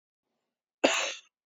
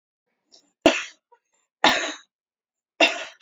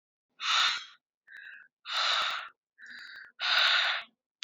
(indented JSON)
{
  "cough_length": "1.5 s",
  "cough_amplitude": 14414,
  "cough_signal_mean_std_ratio": 0.32,
  "three_cough_length": "3.4 s",
  "three_cough_amplitude": 27961,
  "three_cough_signal_mean_std_ratio": 0.29,
  "exhalation_length": "4.4 s",
  "exhalation_amplitude": 7842,
  "exhalation_signal_mean_std_ratio": 0.53,
  "survey_phase": "alpha (2021-03-01 to 2021-08-12)",
  "age": "18-44",
  "gender": "Female",
  "wearing_mask": "Yes",
  "symptom_none": true,
  "smoker_status": "Current smoker (1 to 10 cigarettes per day)",
  "respiratory_condition_asthma": true,
  "respiratory_condition_other": false,
  "recruitment_source": "Test and Trace",
  "submission_delay": "0 days",
  "covid_test_result": "Negative",
  "covid_test_method": "LFT"
}